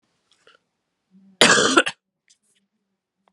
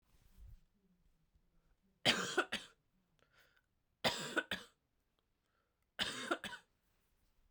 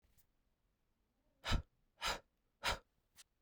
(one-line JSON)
{"cough_length": "3.3 s", "cough_amplitude": 32768, "cough_signal_mean_std_ratio": 0.27, "three_cough_length": "7.5 s", "three_cough_amplitude": 5136, "three_cough_signal_mean_std_ratio": 0.31, "exhalation_length": "3.4 s", "exhalation_amplitude": 2413, "exhalation_signal_mean_std_ratio": 0.28, "survey_phase": "beta (2021-08-13 to 2022-03-07)", "age": "18-44", "gender": "Female", "wearing_mask": "No", "symptom_runny_or_blocked_nose": true, "symptom_fatigue": true, "symptom_headache": true, "symptom_onset": "2 days", "smoker_status": "Never smoked", "respiratory_condition_asthma": false, "respiratory_condition_other": false, "recruitment_source": "Test and Trace", "submission_delay": "1 day", "covid_test_result": "Positive", "covid_test_method": "RT-qPCR", "covid_ct_value": 22.5, "covid_ct_gene": "ORF1ab gene"}